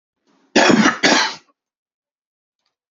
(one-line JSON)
{"cough_length": "2.9 s", "cough_amplitude": 30581, "cough_signal_mean_std_ratio": 0.39, "survey_phase": "beta (2021-08-13 to 2022-03-07)", "age": "18-44", "gender": "Male", "wearing_mask": "No", "symptom_none": true, "smoker_status": "Current smoker (11 or more cigarettes per day)", "respiratory_condition_asthma": false, "respiratory_condition_other": false, "recruitment_source": "REACT", "submission_delay": "1 day", "covid_test_result": "Negative", "covid_test_method": "RT-qPCR", "influenza_a_test_result": "Negative", "influenza_b_test_result": "Negative"}